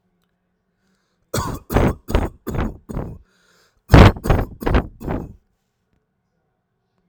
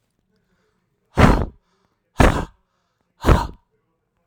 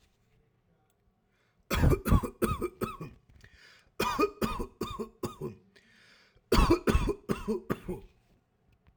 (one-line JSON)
{"cough_length": "7.1 s", "cough_amplitude": 32768, "cough_signal_mean_std_ratio": 0.33, "exhalation_length": "4.3 s", "exhalation_amplitude": 32768, "exhalation_signal_mean_std_ratio": 0.31, "three_cough_length": "9.0 s", "three_cough_amplitude": 9703, "three_cough_signal_mean_std_ratio": 0.41, "survey_phase": "alpha (2021-03-01 to 2021-08-12)", "age": "18-44", "gender": "Male", "wearing_mask": "Yes", "symptom_none": true, "smoker_status": "Never smoked", "respiratory_condition_asthma": false, "respiratory_condition_other": false, "recruitment_source": "REACT", "submission_delay": "1 day", "covid_test_result": "Negative", "covid_test_method": "RT-qPCR"}